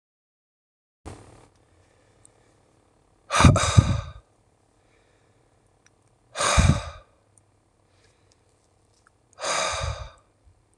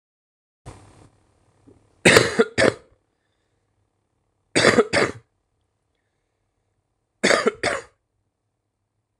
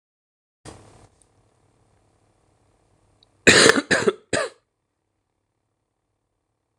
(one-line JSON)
{"exhalation_length": "10.8 s", "exhalation_amplitude": 26027, "exhalation_signal_mean_std_ratio": 0.28, "three_cough_length": "9.2 s", "three_cough_amplitude": 26028, "three_cough_signal_mean_std_ratio": 0.28, "cough_length": "6.8 s", "cough_amplitude": 26028, "cough_signal_mean_std_ratio": 0.23, "survey_phase": "alpha (2021-03-01 to 2021-08-12)", "age": "18-44", "gender": "Male", "wearing_mask": "No", "symptom_cough_any": true, "symptom_new_continuous_cough": true, "symptom_headache": true, "smoker_status": "Never smoked", "respiratory_condition_asthma": false, "respiratory_condition_other": false, "recruitment_source": "Test and Trace", "submission_delay": "2 days", "covid_test_result": "Positive", "covid_test_method": "LFT"}